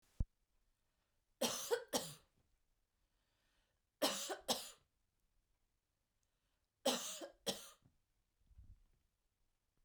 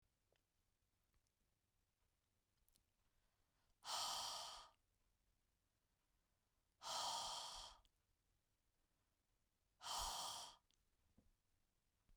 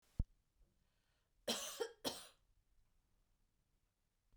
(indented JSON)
{
  "three_cough_length": "9.8 s",
  "three_cough_amplitude": 2452,
  "three_cough_signal_mean_std_ratio": 0.3,
  "exhalation_length": "12.2 s",
  "exhalation_amplitude": 702,
  "exhalation_signal_mean_std_ratio": 0.37,
  "cough_length": "4.4 s",
  "cough_amplitude": 1980,
  "cough_signal_mean_std_ratio": 0.28,
  "survey_phase": "beta (2021-08-13 to 2022-03-07)",
  "age": "45-64",
  "gender": "Female",
  "wearing_mask": "No",
  "symptom_runny_or_blocked_nose": true,
  "smoker_status": "Never smoked",
  "respiratory_condition_asthma": false,
  "respiratory_condition_other": false,
  "recruitment_source": "REACT",
  "submission_delay": "2 days",
  "covid_test_result": "Negative",
  "covid_test_method": "RT-qPCR",
  "influenza_a_test_result": "Negative",
  "influenza_b_test_result": "Negative"
}